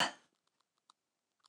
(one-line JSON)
{"cough_length": "1.5 s", "cough_amplitude": 3776, "cough_signal_mean_std_ratio": 0.2, "survey_phase": "alpha (2021-03-01 to 2021-08-12)", "age": "45-64", "gender": "Female", "wearing_mask": "No", "symptom_none": true, "smoker_status": "Never smoked", "respiratory_condition_asthma": false, "respiratory_condition_other": false, "recruitment_source": "REACT", "submission_delay": "2 days", "covid_test_result": "Negative", "covid_test_method": "RT-qPCR"}